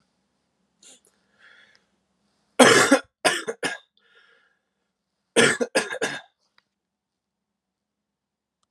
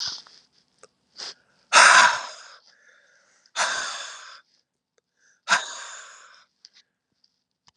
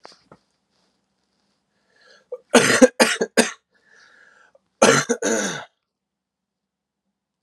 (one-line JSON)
{"three_cough_length": "8.7 s", "three_cough_amplitude": 32738, "three_cough_signal_mean_std_ratio": 0.26, "exhalation_length": "7.8 s", "exhalation_amplitude": 30077, "exhalation_signal_mean_std_ratio": 0.28, "cough_length": "7.4 s", "cough_amplitude": 32767, "cough_signal_mean_std_ratio": 0.29, "survey_phase": "alpha (2021-03-01 to 2021-08-12)", "age": "18-44", "gender": "Male", "wearing_mask": "No", "symptom_cough_any": true, "symptom_fatigue": true, "symptom_headache": true, "smoker_status": "Never smoked", "respiratory_condition_asthma": false, "respiratory_condition_other": false, "recruitment_source": "Test and Trace", "submission_delay": "1 day", "covid_test_result": "Positive", "covid_test_method": "LFT"}